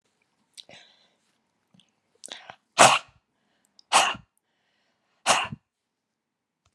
{"exhalation_length": "6.7 s", "exhalation_amplitude": 31892, "exhalation_signal_mean_std_ratio": 0.22, "survey_phase": "beta (2021-08-13 to 2022-03-07)", "age": "65+", "gender": "Female", "wearing_mask": "No", "symptom_cough_any": true, "smoker_status": "Never smoked", "respiratory_condition_asthma": false, "respiratory_condition_other": false, "recruitment_source": "REACT", "submission_delay": "3 days", "covid_test_result": "Negative", "covid_test_method": "RT-qPCR", "influenza_a_test_result": "Negative", "influenza_b_test_result": "Negative"}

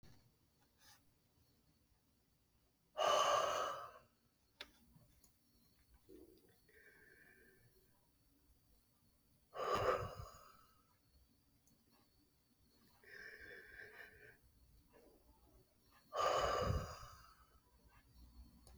{"exhalation_length": "18.8 s", "exhalation_amplitude": 2165, "exhalation_signal_mean_std_ratio": 0.34, "survey_phase": "beta (2021-08-13 to 2022-03-07)", "age": "45-64", "gender": "Male", "wearing_mask": "No", "symptom_none": true, "smoker_status": "Ex-smoker", "respiratory_condition_asthma": false, "respiratory_condition_other": false, "recruitment_source": "REACT", "submission_delay": "1 day", "covid_test_result": "Negative", "covid_test_method": "RT-qPCR", "influenza_a_test_result": "Negative", "influenza_b_test_result": "Negative"}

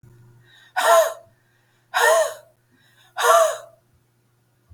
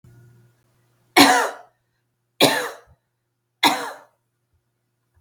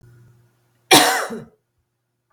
{"exhalation_length": "4.7 s", "exhalation_amplitude": 27588, "exhalation_signal_mean_std_ratio": 0.41, "three_cough_length": "5.2 s", "three_cough_amplitude": 32768, "three_cough_signal_mean_std_ratio": 0.29, "cough_length": "2.3 s", "cough_amplitude": 32768, "cough_signal_mean_std_ratio": 0.3, "survey_phase": "beta (2021-08-13 to 2022-03-07)", "age": "45-64", "gender": "Female", "wearing_mask": "No", "symptom_cough_any": true, "symptom_runny_or_blocked_nose": true, "symptom_shortness_of_breath": true, "symptom_sore_throat": true, "symptom_fever_high_temperature": true, "symptom_headache": true, "symptom_onset": "3 days", "smoker_status": "Never smoked", "respiratory_condition_asthma": false, "respiratory_condition_other": false, "recruitment_source": "Test and Trace", "submission_delay": "1 day", "covid_test_result": "Positive", "covid_test_method": "RT-qPCR", "covid_ct_value": 25.4, "covid_ct_gene": "ORF1ab gene", "covid_ct_mean": 25.5, "covid_viral_load": "4200 copies/ml", "covid_viral_load_category": "Minimal viral load (< 10K copies/ml)"}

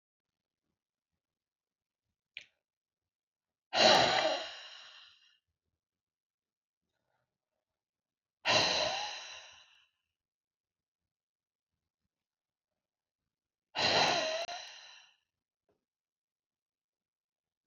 {"exhalation_length": "17.7 s", "exhalation_amplitude": 9031, "exhalation_signal_mean_std_ratio": 0.27, "survey_phase": "beta (2021-08-13 to 2022-03-07)", "age": "45-64", "gender": "Female", "wearing_mask": "No", "symptom_cough_any": true, "symptom_fatigue": true, "symptom_headache": true, "symptom_change_to_sense_of_smell_or_taste": true, "symptom_onset": "6 days", "smoker_status": "Never smoked", "respiratory_condition_asthma": true, "respiratory_condition_other": false, "recruitment_source": "Test and Trace", "submission_delay": "1 day", "covid_test_result": "Positive", "covid_test_method": "RT-qPCR", "covid_ct_value": 18.8, "covid_ct_gene": "ORF1ab gene", "covid_ct_mean": 19.4, "covid_viral_load": "440000 copies/ml", "covid_viral_load_category": "Low viral load (10K-1M copies/ml)"}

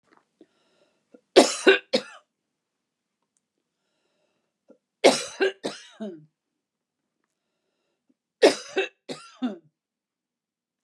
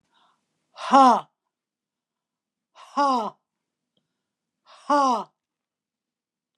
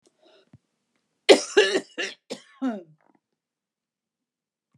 {"three_cough_length": "10.8 s", "three_cough_amplitude": 32710, "three_cough_signal_mean_std_ratio": 0.23, "exhalation_length": "6.6 s", "exhalation_amplitude": 24895, "exhalation_signal_mean_std_ratio": 0.29, "cough_length": "4.8 s", "cough_amplitude": 28949, "cough_signal_mean_std_ratio": 0.24, "survey_phase": "beta (2021-08-13 to 2022-03-07)", "age": "65+", "gender": "Female", "wearing_mask": "No", "symptom_none": true, "smoker_status": "Never smoked", "respiratory_condition_asthma": false, "respiratory_condition_other": false, "recruitment_source": "REACT", "submission_delay": "1 day", "covid_test_result": "Negative", "covid_test_method": "RT-qPCR"}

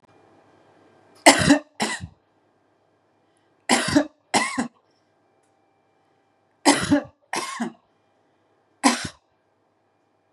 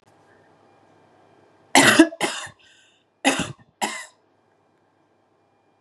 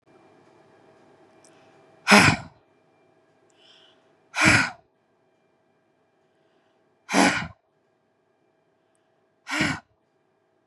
{"three_cough_length": "10.3 s", "three_cough_amplitude": 32768, "three_cough_signal_mean_std_ratio": 0.3, "cough_length": "5.8 s", "cough_amplitude": 32767, "cough_signal_mean_std_ratio": 0.27, "exhalation_length": "10.7 s", "exhalation_amplitude": 30447, "exhalation_signal_mean_std_ratio": 0.25, "survey_phase": "beta (2021-08-13 to 2022-03-07)", "age": "45-64", "gender": "Female", "wearing_mask": "No", "symptom_none": true, "smoker_status": "Ex-smoker", "respiratory_condition_asthma": false, "respiratory_condition_other": false, "recruitment_source": "REACT", "submission_delay": "2 days", "covid_test_result": "Negative", "covid_test_method": "RT-qPCR", "influenza_a_test_result": "Negative", "influenza_b_test_result": "Negative"}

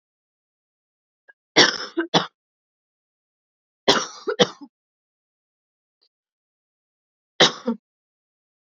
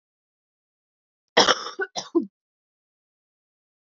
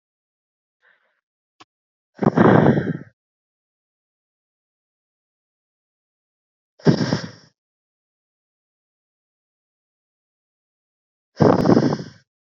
{"three_cough_length": "8.6 s", "three_cough_amplitude": 32509, "three_cough_signal_mean_std_ratio": 0.23, "cough_length": "3.8 s", "cough_amplitude": 27703, "cough_signal_mean_std_ratio": 0.24, "exhalation_length": "12.5 s", "exhalation_amplitude": 31049, "exhalation_signal_mean_std_ratio": 0.26, "survey_phase": "beta (2021-08-13 to 2022-03-07)", "age": "18-44", "gender": "Female", "wearing_mask": "No", "symptom_cough_any": true, "symptom_shortness_of_breath": true, "symptom_sore_throat": true, "symptom_abdominal_pain": true, "symptom_diarrhoea": true, "symptom_fatigue": true, "symptom_fever_high_temperature": true, "symptom_headache": true, "symptom_change_to_sense_of_smell_or_taste": true, "symptom_onset": "5 days", "smoker_status": "Current smoker (1 to 10 cigarettes per day)", "respiratory_condition_asthma": false, "respiratory_condition_other": false, "recruitment_source": "Test and Trace", "submission_delay": "2 days", "covid_test_result": "Positive", "covid_test_method": "ePCR"}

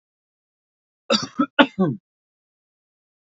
{"cough_length": "3.3 s", "cough_amplitude": 28415, "cough_signal_mean_std_ratio": 0.26, "survey_phase": "beta (2021-08-13 to 2022-03-07)", "age": "18-44", "gender": "Male", "wearing_mask": "No", "symptom_none": true, "smoker_status": "Current smoker (e-cigarettes or vapes only)", "respiratory_condition_asthma": false, "respiratory_condition_other": false, "recruitment_source": "REACT", "submission_delay": "2 days", "covid_test_result": "Negative", "covid_test_method": "RT-qPCR", "influenza_a_test_result": "Negative", "influenza_b_test_result": "Negative"}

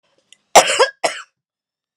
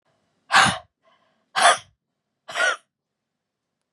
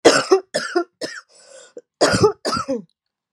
{"cough_length": "2.0 s", "cough_amplitude": 32768, "cough_signal_mean_std_ratio": 0.31, "exhalation_length": "3.9 s", "exhalation_amplitude": 28068, "exhalation_signal_mean_std_ratio": 0.31, "three_cough_length": "3.3 s", "three_cough_amplitude": 32768, "three_cough_signal_mean_std_ratio": 0.45, "survey_phase": "beta (2021-08-13 to 2022-03-07)", "age": "18-44", "gender": "Female", "wearing_mask": "No", "symptom_new_continuous_cough": true, "symptom_runny_or_blocked_nose": true, "symptom_fatigue": true, "symptom_fever_high_temperature": true, "symptom_headache": true, "symptom_change_to_sense_of_smell_or_taste": true, "symptom_loss_of_taste": true, "symptom_onset": "3 days", "smoker_status": "Ex-smoker", "respiratory_condition_asthma": true, "respiratory_condition_other": false, "recruitment_source": "Test and Trace", "submission_delay": "1 day", "covid_test_result": "Positive", "covid_test_method": "RT-qPCR", "covid_ct_value": 19.1, "covid_ct_gene": "ORF1ab gene", "covid_ct_mean": 20.1, "covid_viral_load": "260000 copies/ml", "covid_viral_load_category": "Low viral load (10K-1M copies/ml)"}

